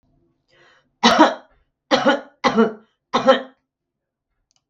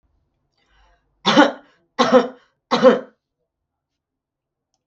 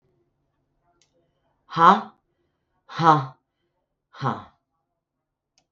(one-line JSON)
{"three_cough_length": "4.7 s", "three_cough_amplitude": 32768, "three_cough_signal_mean_std_ratio": 0.36, "cough_length": "4.9 s", "cough_amplitude": 32766, "cough_signal_mean_std_ratio": 0.3, "exhalation_length": "5.7 s", "exhalation_amplitude": 32379, "exhalation_signal_mean_std_ratio": 0.24, "survey_phase": "beta (2021-08-13 to 2022-03-07)", "age": "45-64", "gender": "Female", "wearing_mask": "No", "symptom_none": true, "smoker_status": "Ex-smoker", "respiratory_condition_asthma": false, "respiratory_condition_other": false, "recruitment_source": "REACT", "submission_delay": "3 days", "covid_test_result": "Negative", "covid_test_method": "RT-qPCR"}